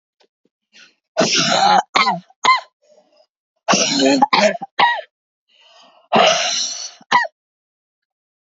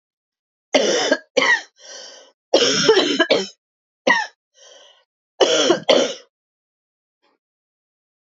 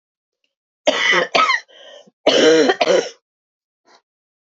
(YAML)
exhalation_length: 8.4 s
exhalation_amplitude: 32767
exhalation_signal_mean_std_ratio: 0.49
three_cough_length: 8.3 s
three_cough_amplitude: 27915
three_cough_signal_mean_std_ratio: 0.43
cough_length: 4.4 s
cough_amplitude: 29660
cough_signal_mean_std_ratio: 0.47
survey_phase: beta (2021-08-13 to 2022-03-07)
age: 45-64
gender: Female
wearing_mask: 'No'
symptom_cough_any: true
symptom_runny_or_blocked_nose: true
symptom_shortness_of_breath: true
symptom_sore_throat: true
symptom_fatigue: true
symptom_fever_high_temperature: true
symptom_headache: true
symptom_change_to_sense_of_smell_or_taste: true
symptom_loss_of_taste: true
symptom_onset: 4 days
smoker_status: Ex-smoker
respiratory_condition_asthma: false
respiratory_condition_other: false
recruitment_source: Test and Trace
submission_delay: 1 day
covid_test_result: Positive
covid_test_method: RT-qPCR
covid_ct_value: 15.5
covid_ct_gene: ORF1ab gene
covid_ct_mean: 15.8
covid_viral_load: 6400000 copies/ml
covid_viral_load_category: High viral load (>1M copies/ml)